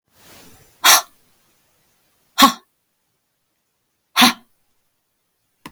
{"exhalation_length": "5.7 s", "exhalation_amplitude": 32768, "exhalation_signal_mean_std_ratio": 0.23, "survey_phase": "beta (2021-08-13 to 2022-03-07)", "age": "45-64", "gender": "Female", "wearing_mask": "No", "symptom_none": true, "smoker_status": "Never smoked", "respiratory_condition_asthma": false, "respiratory_condition_other": false, "recruitment_source": "REACT", "submission_delay": "1 day", "covid_test_result": "Negative", "covid_test_method": "RT-qPCR"}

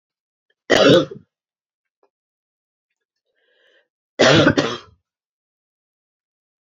{"three_cough_length": "6.7 s", "three_cough_amplitude": 32661, "three_cough_signal_mean_std_ratio": 0.28, "survey_phase": "beta (2021-08-13 to 2022-03-07)", "age": "45-64", "gender": "Female", "wearing_mask": "No", "symptom_cough_any": true, "symptom_runny_or_blocked_nose": true, "symptom_fatigue": true, "symptom_headache": true, "smoker_status": "Ex-smoker", "respiratory_condition_asthma": false, "respiratory_condition_other": false, "recruitment_source": "Test and Trace", "submission_delay": "1 day", "covid_test_result": "Positive", "covid_test_method": "RT-qPCR"}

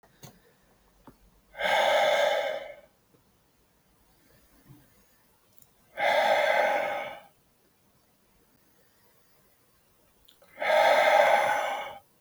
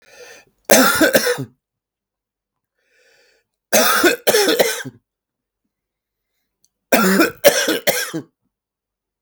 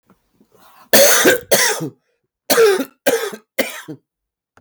{"exhalation_length": "12.2 s", "exhalation_amplitude": 11949, "exhalation_signal_mean_std_ratio": 0.45, "three_cough_length": "9.2 s", "three_cough_amplitude": 32768, "three_cough_signal_mean_std_ratio": 0.42, "cough_length": "4.6 s", "cough_amplitude": 32768, "cough_signal_mean_std_ratio": 0.48, "survey_phase": "beta (2021-08-13 to 2022-03-07)", "age": "45-64", "gender": "Male", "wearing_mask": "No", "symptom_cough_any": true, "symptom_new_continuous_cough": true, "symptom_runny_or_blocked_nose": true, "symptom_shortness_of_breath": true, "symptom_sore_throat": true, "symptom_abdominal_pain": true, "symptom_fatigue": true, "symptom_headache": true, "symptom_change_to_sense_of_smell_or_taste": true, "symptom_loss_of_taste": true, "symptom_onset": "2 days", "smoker_status": "Never smoked", "respiratory_condition_asthma": false, "respiratory_condition_other": false, "recruitment_source": "Test and Trace", "submission_delay": "2 days", "covid_test_result": "Positive", "covid_test_method": "ePCR"}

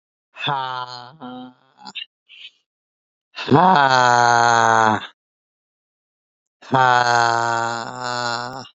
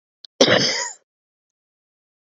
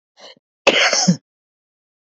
{"exhalation_length": "8.8 s", "exhalation_amplitude": 29546, "exhalation_signal_mean_std_ratio": 0.44, "cough_length": "2.3 s", "cough_amplitude": 32768, "cough_signal_mean_std_ratio": 0.33, "three_cough_length": "2.1 s", "three_cough_amplitude": 29199, "three_cough_signal_mean_std_ratio": 0.38, "survey_phase": "beta (2021-08-13 to 2022-03-07)", "age": "18-44", "gender": "Male", "wearing_mask": "No", "symptom_cough_any": true, "symptom_onset": "12 days", "smoker_status": "Never smoked", "respiratory_condition_asthma": false, "respiratory_condition_other": false, "recruitment_source": "REACT", "submission_delay": "1 day", "covid_test_result": "Negative", "covid_test_method": "RT-qPCR"}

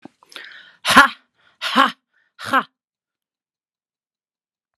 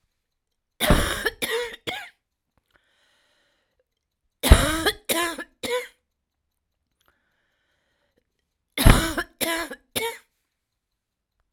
{"exhalation_length": "4.8 s", "exhalation_amplitude": 32768, "exhalation_signal_mean_std_ratio": 0.26, "three_cough_length": "11.5 s", "three_cough_amplitude": 32767, "three_cough_signal_mean_std_ratio": 0.3, "survey_phase": "alpha (2021-03-01 to 2021-08-12)", "age": "45-64", "gender": "Female", "wearing_mask": "No", "symptom_cough_any": true, "symptom_shortness_of_breath": true, "symptom_fatigue": true, "symptom_headache": true, "symptom_change_to_sense_of_smell_or_taste": true, "symptom_loss_of_taste": true, "symptom_onset": "10 days", "smoker_status": "Never smoked", "respiratory_condition_asthma": false, "respiratory_condition_other": false, "recruitment_source": "Test and Trace", "submission_delay": "1 day", "covid_test_result": "Positive", "covid_test_method": "RT-qPCR", "covid_ct_value": 21.8, "covid_ct_gene": "S gene", "covid_ct_mean": 22.3, "covid_viral_load": "47000 copies/ml", "covid_viral_load_category": "Low viral load (10K-1M copies/ml)"}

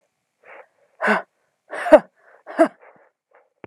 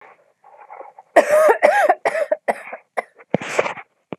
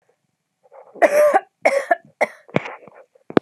{"exhalation_length": "3.7 s", "exhalation_amplitude": 32768, "exhalation_signal_mean_std_ratio": 0.25, "cough_length": "4.2 s", "cough_amplitude": 32768, "cough_signal_mean_std_ratio": 0.46, "three_cough_length": "3.4 s", "three_cough_amplitude": 32768, "three_cough_signal_mean_std_ratio": 0.37, "survey_phase": "alpha (2021-03-01 to 2021-08-12)", "age": "18-44", "gender": "Female", "wearing_mask": "No", "symptom_fatigue": true, "symptom_onset": "2 days", "smoker_status": "Never smoked", "respiratory_condition_asthma": false, "respiratory_condition_other": false, "recruitment_source": "REACT", "submission_delay": "3 days", "covid_test_result": "Negative", "covid_test_method": "RT-qPCR"}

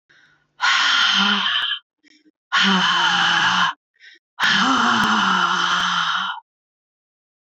{"exhalation_length": "7.4 s", "exhalation_amplitude": 19696, "exhalation_signal_mean_std_ratio": 0.75, "survey_phase": "beta (2021-08-13 to 2022-03-07)", "age": "45-64", "gender": "Female", "wearing_mask": "No", "symptom_cough_any": true, "symptom_runny_or_blocked_nose": true, "symptom_shortness_of_breath": true, "symptom_fatigue": true, "symptom_headache": true, "smoker_status": "Never smoked", "respiratory_condition_asthma": false, "respiratory_condition_other": false, "recruitment_source": "Test and Trace", "submission_delay": "3 days", "covid_test_result": "Negative", "covid_test_method": "RT-qPCR"}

